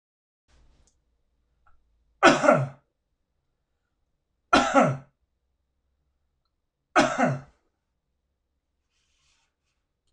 {"three_cough_length": "10.1 s", "three_cough_amplitude": 26021, "three_cough_signal_mean_std_ratio": 0.26, "survey_phase": "beta (2021-08-13 to 2022-03-07)", "age": "45-64", "gender": "Male", "wearing_mask": "No", "symptom_none": true, "smoker_status": "Ex-smoker", "respiratory_condition_asthma": false, "respiratory_condition_other": true, "recruitment_source": "REACT", "submission_delay": "2 days", "covid_test_result": "Negative", "covid_test_method": "RT-qPCR", "influenza_a_test_result": "Negative", "influenza_b_test_result": "Negative"}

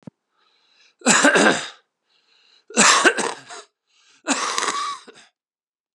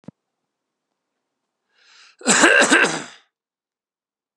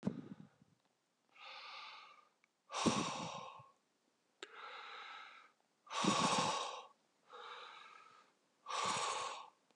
{"three_cough_length": "5.9 s", "three_cough_amplitude": 32764, "three_cough_signal_mean_std_ratio": 0.41, "cough_length": "4.4 s", "cough_amplitude": 32768, "cough_signal_mean_std_ratio": 0.32, "exhalation_length": "9.8 s", "exhalation_amplitude": 3281, "exhalation_signal_mean_std_ratio": 0.48, "survey_phase": "beta (2021-08-13 to 2022-03-07)", "age": "45-64", "gender": "Male", "wearing_mask": "No", "symptom_cough_any": true, "symptom_runny_or_blocked_nose": true, "symptom_headache": true, "symptom_onset": "4 days", "smoker_status": "Never smoked", "respiratory_condition_asthma": false, "respiratory_condition_other": false, "recruitment_source": "Test and Trace", "submission_delay": "2 days", "covid_test_result": "Positive", "covid_test_method": "RT-qPCR", "covid_ct_value": 21.6, "covid_ct_gene": "ORF1ab gene"}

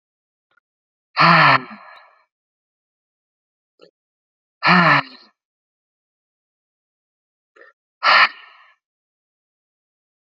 {"exhalation_length": "10.2 s", "exhalation_amplitude": 29566, "exhalation_signal_mean_std_ratio": 0.26, "survey_phase": "alpha (2021-03-01 to 2021-08-12)", "age": "18-44", "gender": "Male", "wearing_mask": "No", "symptom_cough_any": true, "symptom_new_continuous_cough": true, "symptom_shortness_of_breath": true, "symptom_abdominal_pain": true, "symptom_diarrhoea": true, "symptom_fatigue": true, "symptom_fever_high_temperature": true, "symptom_headache": true, "symptom_change_to_sense_of_smell_or_taste": true, "symptom_loss_of_taste": true, "smoker_status": "Current smoker (11 or more cigarettes per day)", "respiratory_condition_asthma": false, "respiratory_condition_other": false, "recruitment_source": "Test and Trace", "submission_delay": "1 day", "covid_test_result": "Positive", "covid_test_method": "RT-qPCR", "covid_ct_value": 20.6, "covid_ct_gene": "ORF1ab gene", "covid_ct_mean": 21.3, "covid_viral_load": "100000 copies/ml", "covid_viral_load_category": "Low viral load (10K-1M copies/ml)"}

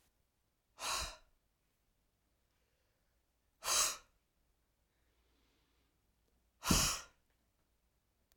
{"exhalation_length": "8.4 s", "exhalation_amplitude": 5222, "exhalation_signal_mean_std_ratio": 0.26, "survey_phase": "alpha (2021-03-01 to 2021-08-12)", "age": "45-64", "gender": "Female", "wearing_mask": "No", "symptom_none": true, "smoker_status": "Ex-smoker", "respiratory_condition_asthma": false, "respiratory_condition_other": false, "recruitment_source": "REACT", "submission_delay": "2 days", "covid_test_result": "Negative", "covid_test_method": "RT-qPCR"}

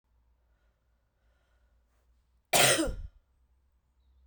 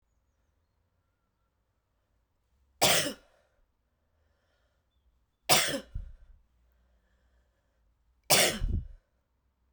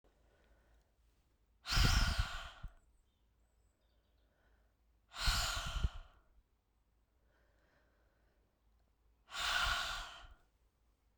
{"cough_length": "4.3 s", "cough_amplitude": 11602, "cough_signal_mean_std_ratio": 0.26, "three_cough_length": "9.7 s", "three_cough_amplitude": 19402, "three_cough_signal_mean_std_ratio": 0.26, "exhalation_length": "11.2 s", "exhalation_amplitude": 4079, "exhalation_signal_mean_std_ratio": 0.36, "survey_phase": "beta (2021-08-13 to 2022-03-07)", "age": "18-44", "gender": "Female", "wearing_mask": "No", "symptom_cough_any": true, "symptom_runny_or_blocked_nose": true, "symptom_sore_throat": true, "symptom_fatigue": true, "symptom_fever_high_temperature": true, "symptom_headache": true, "symptom_loss_of_taste": true, "symptom_onset": "3 days", "smoker_status": "Never smoked", "respiratory_condition_asthma": false, "respiratory_condition_other": false, "recruitment_source": "Test and Trace", "submission_delay": "2 days", "covid_test_result": "Positive", "covid_test_method": "ePCR"}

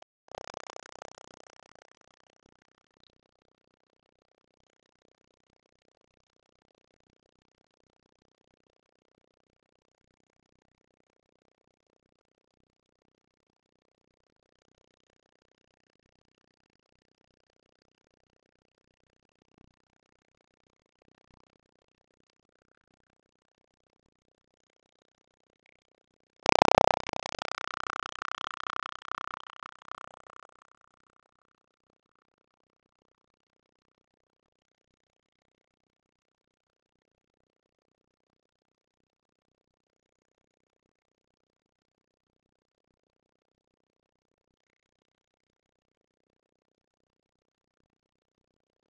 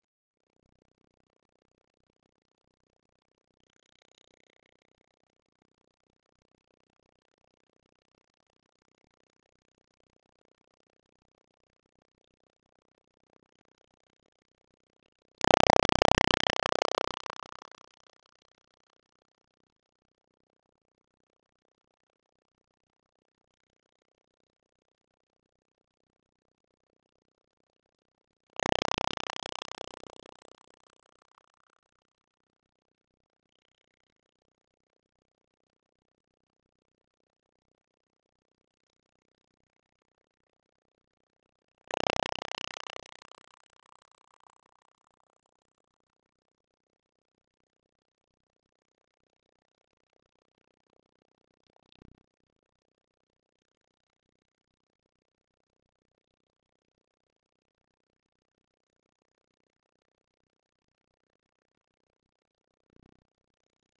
{"cough_length": "48.9 s", "cough_amplitude": 25620, "cough_signal_mean_std_ratio": 0.05, "three_cough_length": "64.0 s", "three_cough_amplitude": 21897, "three_cough_signal_mean_std_ratio": 0.05, "survey_phase": "beta (2021-08-13 to 2022-03-07)", "age": "65+", "gender": "Female", "wearing_mask": "No", "symptom_cough_any": true, "smoker_status": "Ex-smoker", "respiratory_condition_asthma": false, "respiratory_condition_other": false, "recruitment_source": "Test and Trace", "submission_delay": "1 day", "covid_test_result": "Negative", "covid_test_method": "RT-qPCR"}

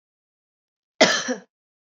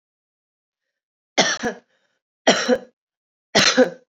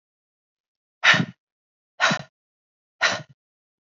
{"cough_length": "1.9 s", "cough_amplitude": 26638, "cough_signal_mean_std_ratio": 0.28, "three_cough_length": "4.2 s", "three_cough_amplitude": 29554, "three_cough_signal_mean_std_ratio": 0.34, "exhalation_length": "3.9 s", "exhalation_amplitude": 24554, "exhalation_signal_mean_std_ratio": 0.28, "survey_phase": "beta (2021-08-13 to 2022-03-07)", "age": "18-44", "gender": "Female", "wearing_mask": "No", "symptom_sore_throat": true, "symptom_change_to_sense_of_smell_or_taste": true, "smoker_status": "Current smoker (e-cigarettes or vapes only)", "respiratory_condition_asthma": false, "respiratory_condition_other": false, "recruitment_source": "Test and Trace", "submission_delay": "1 day", "covid_test_result": "Positive", "covid_test_method": "RT-qPCR"}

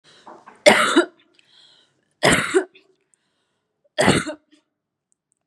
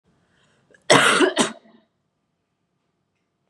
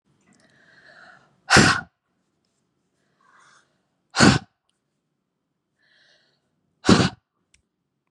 {"three_cough_length": "5.5 s", "three_cough_amplitude": 32767, "three_cough_signal_mean_std_ratio": 0.33, "cough_length": "3.5 s", "cough_amplitude": 32636, "cough_signal_mean_std_ratio": 0.31, "exhalation_length": "8.1 s", "exhalation_amplitude": 29524, "exhalation_signal_mean_std_ratio": 0.23, "survey_phase": "beta (2021-08-13 to 2022-03-07)", "age": "18-44", "gender": "Female", "wearing_mask": "No", "symptom_runny_or_blocked_nose": true, "symptom_fatigue": true, "symptom_headache": true, "symptom_onset": "2 days", "smoker_status": "Never smoked", "respiratory_condition_asthma": false, "respiratory_condition_other": false, "recruitment_source": "REACT", "submission_delay": "0 days", "covid_test_result": "Negative", "covid_test_method": "RT-qPCR", "influenza_a_test_result": "Negative", "influenza_b_test_result": "Negative"}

